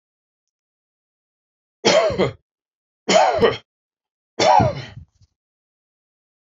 {"three_cough_length": "6.5 s", "three_cough_amplitude": 25861, "three_cough_signal_mean_std_ratio": 0.36, "survey_phase": "beta (2021-08-13 to 2022-03-07)", "age": "65+", "gender": "Male", "wearing_mask": "No", "symptom_none": true, "smoker_status": "Ex-smoker", "respiratory_condition_asthma": false, "respiratory_condition_other": false, "recruitment_source": "REACT", "submission_delay": "4 days", "covid_test_result": "Negative", "covid_test_method": "RT-qPCR", "influenza_a_test_result": "Negative", "influenza_b_test_result": "Negative"}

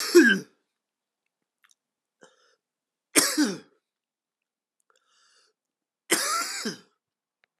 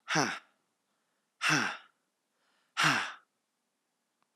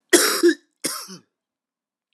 {"three_cough_length": "7.6 s", "three_cough_amplitude": 23954, "three_cough_signal_mean_std_ratio": 0.28, "exhalation_length": "4.4 s", "exhalation_amplitude": 8520, "exhalation_signal_mean_std_ratio": 0.36, "cough_length": "2.1 s", "cough_amplitude": 32543, "cough_signal_mean_std_ratio": 0.37, "survey_phase": "alpha (2021-03-01 to 2021-08-12)", "age": "45-64", "gender": "Male", "wearing_mask": "No", "symptom_cough_any": true, "symptom_fatigue": true, "symptom_change_to_sense_of_smell_or_taste": true, "symptom_loss_of_taste": true, "symptom_onset": "4 days", "smoker_status": "Never smoked", "respiratory_condition_asthma": false, "respiratory_condition_other": false, "recruitment_source": "Test and Trace", "submission_delay": "3 days", "covid_test_result": "Positive", "covid_test_method": "RT-qPCR", "covid_ct_value": 17.0, "covid_ct_gene": "ORF1ab gene", "covid_ct_mean": 17.4, "covid_viral_load": "1900000 copies/ml", "covid_viral_load_category": "High viral load (>1M copies/ml)"}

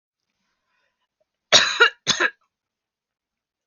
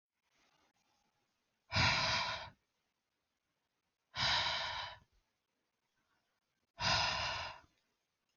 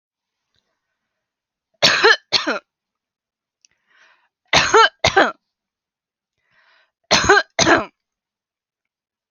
{"cough_length": "3.7 s", "cough_amplitude": 30992, "cough_signal_mean_std_ratio": 0.27, "exhalation_length": "8.4 s", "exhalation_amplitude": 3580, "exhalation_signal_mean_std_ratio": 0.41, "three_cough_length": "9.3 s", "three_cough_amplitude": 31999, "three_cough_signal_mean_std_ratio": 0.32, "survey_phase": "alpha (2021-03-01 to 2021-08-12)", "age": "18-44", "gender": "Female", "wearing_mask": "No", "symptom_none": true, "smoker_status": "Ex-smoker", "respiratory_condition_asthma": false, "respiratory_condition_other": false, "recruitment_source": "REACT", "submission_delay": "1 day", "covid_test_result": "Negative", "covid_test_method": "RT-qPCR"}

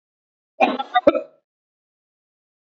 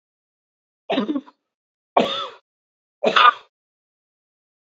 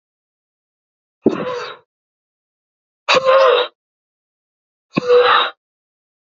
{"cough_length": "2.6 s", "cough_amplitude": 27457, "cough_signal_mean_std_ratio": 0.27, "three_cough_length": "4.7 s", "three_cough_amplitude": 28897, "three_cough_signal_mean_std_ratio": 0.29, "exhalation_length": "6.2 s", "exhalation_amplitude": 31258, "exhalation_signal_mean_std_ratio": 0.38, "survey_phase": "beta (2021-08-13 to 2022-03-07)", "age": "18-44", "gender": "Male", "wearing_mask": "No", "symptom_cough_any": true, "symptom_new_continuous_cough": true, "symptom_shortness_of_breath": true, "symptom_sore_throat": true, "symptom_fatigue": true, "symptom_headache": true, "symptom_other": true, "symptom_onset": "3 days", "smoker_status": "Never smoked", "respiratory_condition_asthma": false, "respiratory_condition_other": false, "recruitment_source": "Test and Trace", "submission_delay": "2 days", "covid_test_result": "Positive", "covid_test_method": "RT-qPCR", "covid_ct_value": 28.3, "covid_ct_gene": "ORF1ab gene"}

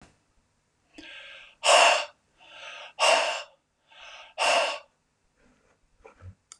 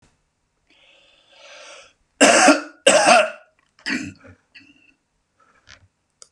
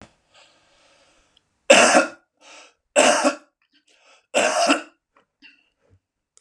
{"exhalation_length": "6.6 s", "exhalation_amplitude": 16175, "exhalation_signal_mean_std_ratio": 0.36, "cough_length": "6.3 s", "cough_amplitude": 32474, "cough_signal_mean_std_ratio": 0.32, "three_cough_length": "6.4 s", "three_cough_amplitude": 32488, "three_cough_signal_mean_std_ratio": 0.34, "survey_phase": "beta (2021-08-13 to 2022-03-07)", "age": "65+", "gender": "Male", "wearing_mask": "No", "symptom_none": true, "smoker_status": "Ex-smoker", "respiratory_condition_asthma": false, "respiratory_condition_other": false, "recruitment_source": "REACT", "submission_delay": "0 days", "covid_test_result": "Negative", "covid_test_method": "RT-qPCR"}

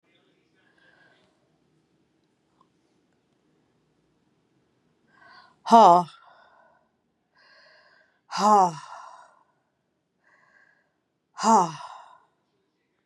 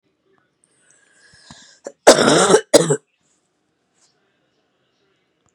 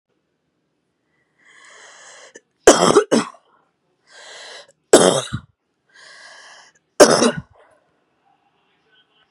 {"exhalation_length": "13.1 s", "exhalation_amplitude": 23315, "exhalation_signal_mean_std_ratio": 0.22, "cough_length": "5.5 s", "cough_amplitude": 32768, "cough_signal_mean_std_ratio": 0.27, "three_cough_length": "9.3 s", "three_cough_amplitude": 32768, "three_cough_signal_mean_std_ratio": 0.26, "survey_phase": "beta (2021-08-13 to 2022-03-07)", "age": "45-64", "gender": "Female", "wearing_mask": "No", "symptom_cough_any": true, "symptom_fatigue": true, "smoker_status": "Never smoked", "respiratory_condition_asthma": true, "respiratory_condition_other": false, "recruitment_source": "REACT", "submission_delay": "2 days", "covid_test_result": "Negative", "covid_test_method": "RT-qPCR", "influenza_a_test_result": "Negative", "influenza_b_test_result": "Negative"}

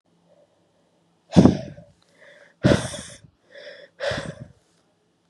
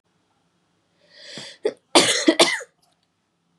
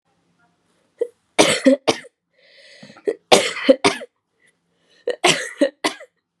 {"exhalation_length": "5.3 s", "exhalation_amplitude": 31305, "exhalation_signal_mean_std_ratio": 0.26, "cough_length": "3.6 s", "cough_amplitude": 31072, "cough_signal_mean_std_ratio": 0.31, "three_cough_length": "6.4 s", "three_cough_amplitude": 32768, "three_cough_signal_mean_std_ratio": 0.34, "survey_phase": "beta (2021-08-13 to 2022-03-07)", "age": "18-44", "gender": "Female", "wearing_mask": "No", "symptom_cough_any": true, "symptom_shortness_of_breath": true, "symptom_sore_throat": true, "symptom_fatigue": true, "symptom_headache": true, "symptom_other": true, "symptom_onset": "2 days", "smoker_status": "Never smoked", "respiratory_condition_asthma": false, "respiratory_condition_other": false, "recruitment_source": "Test and Trace", "submission_delay": "2 days", "covid_test_result": "Positive", "covid_test_method": "RT-qPCR", "covid_ct_value": 17.2, "covid_ct_gene": "ORF1ab gene"}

